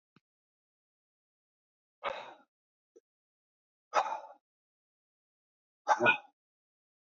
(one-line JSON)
{"exhalation_length": "7.2 s", "exhalation_amplitude": 7874, "exhalation_signal_mean_std_ratio": 0.21, "survey_phase": "beta (2021-08-13 to 2022-03-07)", "age": "45-64", "gender": "Male", "wearing_mask": "No", "symptom_cough_any": true, "symptom_shortness_of_breath": true, "symptom_sore_throat": true, "symptom_onset": "6 days", "smoker_status": "Never smoked", "respiratory_condition_asthma": false, "respiratory_condition_other": false, "recruitment_source": "Test and Trace", "submission_delay": "2 days", "covid_test_result": "Positive", "covid_test_method": "ePCR"}